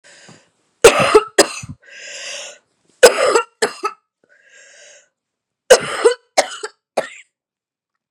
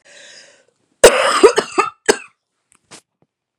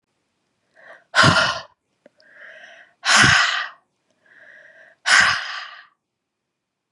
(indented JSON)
{
  "three_cough_length": "8.1 s",
  "three_cough_amplitude": 32768,
  "three_cough_signal_mean_std_ratio": 0.32,
  "cough_length": "3.6 s",
  "cough_amplitude": 32768,
  "cough_signal_mean_std_ratio": 0.32,
  "exhalation_length": "6.9 s",
  "exhalation_amplitude": 30459,
  "exhalation_signal_mean_std_ratio": 0.37,
  "survey_phase": "beta (2021-08-13 to 2022-03-07)",
  "age": "45-64",
  "gender": "Female",
  "wearing_mask": "No",
  "symptom_cough_any": true,
  "symptom_new_continuous_cough": true,
  "symptom_shortness_of_breath": true,
  "symptom_fatigue": true,
  "symptom_headache": true,
  "symptom_change_to_sense_of_smell_or_taste": true,
  "symptom_loss_of_taste": true,
  "symptom_onset": "3 days",
  "smoker_status": "Ex-smoker",
  "respiratory_condition_asthma": false,
  "respiratory_condition_other": false,
  "recruitment_source": "Test and Trace",
  "submission_delay": "1 day",
  "covid_test_result": "Positive",
  "covid_test_method": "ePCR"
}